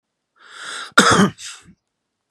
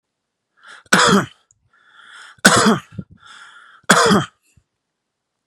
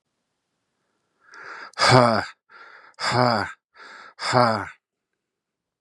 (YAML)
cough_length: 2.3 s
cough_amplitude: 32768
cough_signal_mean_std_ratio: 0.35
three_cough_length: 5.5 s
three_cough_amplitude: 32768
three_cough_signal_mean_std_ratio: 0.36
exhalation_length: 5.8 s
exhalation_amplitude: 32767
exhalation_signal_mean_std_ratio: 0.36
survey_phase: beta (2021-08-13 to 2022-03-07)
age: 18-44
gender: Male
wearing_mask: 'No'
symptom_none: true
symptom_onset: 12 days
smoker_status: Prefer not to say
respiratory_condition_asthma: false
respiratory_condition_other: false
recruitment_source: REACT
submission_delay: 1 day
covid_test_result: Negative
covid_test_method: RT-qPCR
influenza_a_test_result: Negative
influenza_b_test_result: Negative